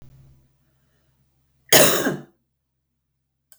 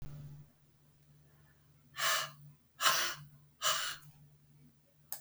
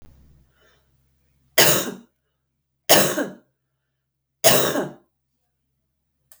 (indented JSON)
{
  "cough_length": "3.6 s",
  "cough_amplitude": 32768,
  "cough_signal_mean_std_ratio": 0.25,
  "exhalation_length": "5.2 s",
  "exhalation_amplitude": 7711,
  "exhalation_signal_mean_std_ratio": 0.42,
  "three_cough_length": "6.4 s",
  "three_cough_amplitude": 32768,
  "three_cough_signal_mean_std_ratio": 0.31,
  "survey_phase": "beta (2021-08-13 to 2022-03-07)",
  "age": "45-64",
  "gender": "Female",
  "wearing_mask": "No",
  "symptom_runny_or_blocked_nose": true,
  "symptom_fatigue": true,
  "symptom_change_to_sense_of_smell_or_taste": true,
  "symptom_loss_of_taste": true,
  "smoker_status": "Never smoked",
  "respiratory_condition_asthma": false,
  "respiratory_condition_other": false,
  "recruitment_source": "Test and Trace",
  "submission_delay": "2 days",
  "covid_test_result": "Positive",
  "covid_test_method": "RT-qPCR"
}